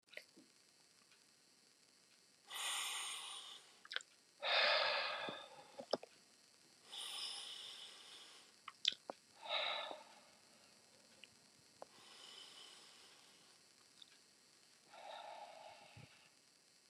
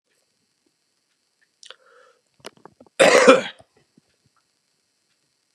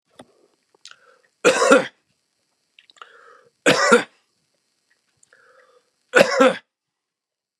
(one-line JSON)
{"exhalation_length": "16.9 s", "exhalation_amplitude": 5851, "exhalation_signal_mean_std_ratio": 0.41, "cough_length": "5.5 s", "cough_amplitude": 29204, "cough_signal_mean_std_ratio": 0.22, "three_cough_length": "7.6 s", "three_cough_amplitude": 29204, "three_cough_signal_mean_std_ratio": 0.3, "survey_phase": "beta (2021-08-13 to 2022-03-07)", "age": "45-64", "gender": "Male", "wearing_mask": "No", "symptom_none": true, "smoker_status": "Current smoker (1 to 10 cigarettes per day)", "respiratory_condition_asthma": false, "respiratory_condition_other": false, "recruitment_source": "REACT", "submission_delay": "1 day", "covid_test_result": "Negative", "covid_test_method": "RT-qPCR", "influenza_a_test_result": "Negative", "influenza_b_test_result": "Negative"}